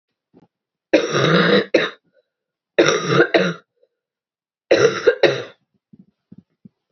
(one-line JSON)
{"three_cough_length": "6.9 s", "three_cough_amplitude": 31047, "three_cough_signal_mean_std_ratio": 0.43, "survey_phase": "beta (2021-08-13 to 2022-03-07)", "age": "18-44", "gender": "Female", "wearing_mask": "No", "symptom_cough_any": true, "symptom_runny_or_blocked_nose": true, "symptom_shortness_of_breath": true, "symptom_fatigue": true, "symptom_headache": true, "symptom_change_to_sense_of_smell_or_taste": true, "symptom_loss_of_taste": true, "symptom_onset": "4 days", "smoker_status": "Never smoked", "respiratory_condition_asthma": false, "respiratory_condition_other": false, "recruitment_source": "Test and Trace", "submission_delay": "2 days", "covid_test_result": "Positive", "covid_test_method": "RT-qPCR", "covid_ct_value": 13.5, "covid_ct_gene": "ORF1ab gene", "covid_ct_mean": 14.0, "covid_viral_load": "25000000 copies/ml", "covid_viral_load_category": "High viral load (>1M copies/ml)"}